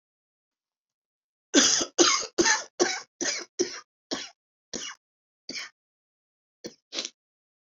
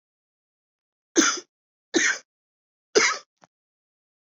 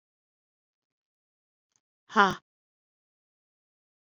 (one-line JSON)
{"cough_length": "7.7 s", "cough_amplitude": 20282, "cough_signal_mean_std_ratio": 0.34, "three_cough_length": "4.4 s", "three_cough_amplitude": 19942, "three_cough_signal_mean_std_ratio": 0.29, "exhalation_length": "4.1 s", "exhalation_amplitude": 19864, "exhalation_signal_mean_std_ratio": 0.13, "survey_phase": "beta (2021-08-13 to 2022-03-07)", "age": "18-44", "gender": "Female", "wearing_mask": "No", "symptom_cough_any": true, "symptom_new_continuous_cough": true, "symptom_runny_or_blocked_nose": true, "symptom_shortness_of_breath": true, "symptom_sore_throat": true, "symptom_fatigue": true, "symptom_headache": true, "symptom_onset": "4 days", "smoker_status": "Never smoked", "respiratory_condition_asthma": true, "respiratory_condition_other": false, "recruitment_source": "Test and Trace", "submission_delay": "2 days", "covid_test_result": "Positive", "covid_test_method": "RT-qPCR", "covid_ct_value": 21.9, "covid_ct_gene": "N gene", "covid_ct_mean": 22.3, "covid_viral_load": "47000 copies/ml", "covid_viral_load_category": "Low viral load (10K-1M copies/ml)"}